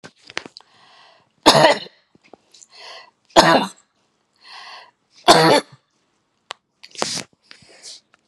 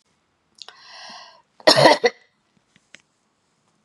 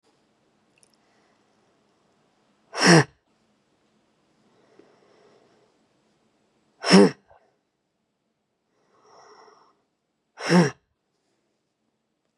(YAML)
three_cough_length: 8.3 s
three_cough_amplitude: 32768
three_cough_signal_mean_std_ratio: 0.29
cough_length: 3.8 s
cough_amplitude: 32718
cough_signal_mean_std_ratio: 0.25
exhalation_length: 12.4 s
exhalation_amplitude: 24438
exhalation_signal_mean_std_ratio: 0.19
survey_phase: beta (2021-08-13 to 2022-03-07)
age: 65+
gender: Female
wearing_mask: 'No'
symptom_none: true
symptom_onset: 9 days
smoker_status: Never smoked
respiratory_condition_asthma: false
respiratory_condition_other: false
recruitment_source: REACT
submission_delay: 1 day
covid_test_result: Negative
covid_test_method: RT-qPCR
covid_ct_value: 37.0
covid_ct_gene: N gene
influenza_a_test_result: Negative
influenza_b_test_result: Negative